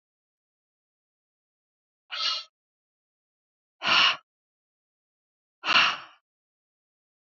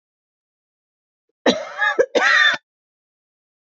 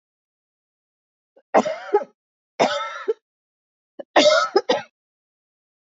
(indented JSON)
{
  "exhalation_length": "7.3 s",
  "exhalation_amplitude": 15042,
  "exhalation_signal_mean_std_ratio": 0.26,
  "cough_length": "3.7 s",
  "cough_amplitude": 25421,
  "cough_signal_mean_std_ratio": 0.38,
  "three_cough_length": "5.8 s",
  "three_cough_amplitude": 26123,
  "three_cough_signal_mean_std_ratio": 0.34,
  "survey_phase": "alpha (2021-03-01 to 2021-08-12)",
  "age": "65+",
  "gender": "Female",
  "wearing_mask": "No",
  "symptom_none": true,
  "smoker_status": "Ex-smoker",
  "respiratory_condition_asthma": false,
  "respiratory_condition_other": false,
  "recruitment_source": "REACT",
  "submission_delay": "2 days",
  "covid_test_result": "Negative",
  "covid_test_method": "RT-qPCR"
}